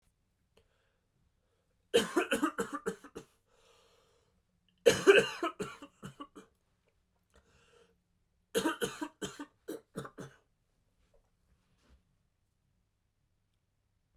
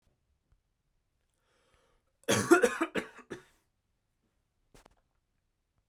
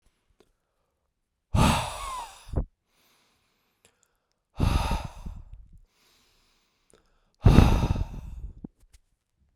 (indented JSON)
{
  "three_cough_length": "14.2 s",
  "three_cough_amplitude": 12428,
  "three_cough_signal_mean_std_ratio": 0.24,
  "cough_length": "5.9 s",
  "cough_amplitude": 12847,
  "cough_signal_mean_std_ratio": 0.23,
  "exhalation_length": "9.6 s",
  "exhalation_amplitude": 29031,
  "exhalation_signal_mean_std_ratio": 0.32,
  "survey_phase": "beta (2021-08-13 to 2022-03-07)",
  "age": "18-44",
  "gender": "Male",
  "wearing_mask": "No",
  "symptom_runny_or_blocked_nose": true,
  "symptom_shortness_of_breath": true,
  "symptom_fatigue": true,
  "symptom_onset": "12 days",
  "smoker_status": "Never smoked",
  "respiratory_condition_asthma": false,
  "respiratory_condition_other": true,
  "recruitment_source": "REACT",
  "submission_delay": "3 days",
  "covid_test_result": "Negative",
  "covid_test_method": "RT-qPCR",
  "influenza_a_test_result": "Negative",
  "influenza_b_test_result": "Negative"
}